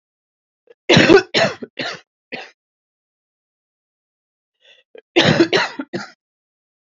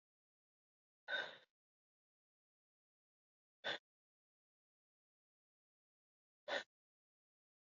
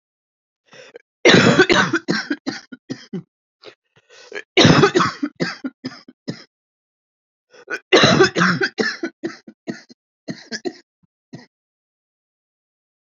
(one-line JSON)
{"cough_length": "6.8 s", "cough_amplitude": 31118, "cough_signal_mean_std_ratio": 0.32, "exhalation_length": "7.8 s", "exhalation_amplitude": 1324, "exhalation_signal_mean_std_ratio": 0.19, "three_cough_length": "13.1 s", "three_cough_amplitude": 31650, "three_cough_signal_mean_std_ratio": 0.36, "survey_phase": "beta (2021-08-13 to 2022-03-07)", "age": "45-64", "gender": "Female", "wearing_mask": "No", "symptom_cough_any": true, "symptom_shortness_of_breath": true, "symptom_sore_throat": true, "symptom_abdominal_pain": true, "symptom_headache": true, "symptom_onset": "12 days", "smoker_status": "Ex-smoker", "respiratory_condition_asthma": false, "respiratory_condition_other": false, "recruitment_source": "REACT", "submission_delay": "5 days", "covid_test_result": "Positive", "covid_test_method": "RT-qPCR", "covid_ct_value": 36.0, "covid_ct_gene": "N gene", "influenza_a_test_result": "Negative", "influenza_b_test_result": "Negative"}